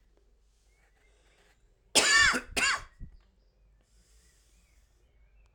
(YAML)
cough_length: 5.5 s
cough_amplitude: 13292
cough_signal_mean_std_ratio: 0.3
survey_phase: alpha (2021-03-01 to 2021-08-12)
age: 45-64
gender: Male
wearing_mask: 'No'
symptom_cough_any: true
symptom_fatigue: true
symptom_change_to_sense_of_smell_or_taste: true
symptom_onset: 3 days
smoker_status: Ex-smoker
respiratory_condition_asthma: false
respiratory_condition_other: false
recruitment_source: Test and Trace
submission_delay: 2 days
covid_test_result: Positive
covid_test_method: RT-qPCR